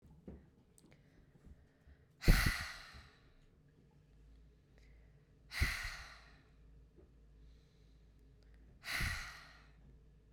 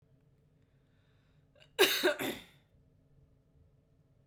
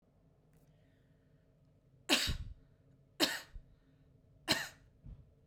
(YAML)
exhalation_length: 10.3 s
exhalation_amplitude: 5775
exhalation_signal_mean_std_ratio: 0.29
cough_length: 4.3 s
cough_amplitude: 8728
cough_signal_mean_std_ratio: 0.27
three_cough_length: 5.5 s
three_cough_amplitude: 6706
three_cough_signal_mean_std_ratio: 0.31
survey_phase: beta (2021-08-13 to 2022-03-07)
age: 18-44
gender: Female
wearing_mask: 'No'
symptom_cough_any: true
symptom_runny_or_blocked_nose: true
symptom_change_to_sense_of_smell_or_taste: true
symptom_loss_of_taste: true
symptom_onset: 4 days
smoker_status: Never smoked
respiratory_condition_asthma: false
respiratory_condition_other: false
recruitment_source: Test and Trace
submission_delay: 2 days
covid_test_result: Positive
covid_test_method: RT-qPCR
covid_ct_value: 20.0
covid_ct_gene: ORF1ab gene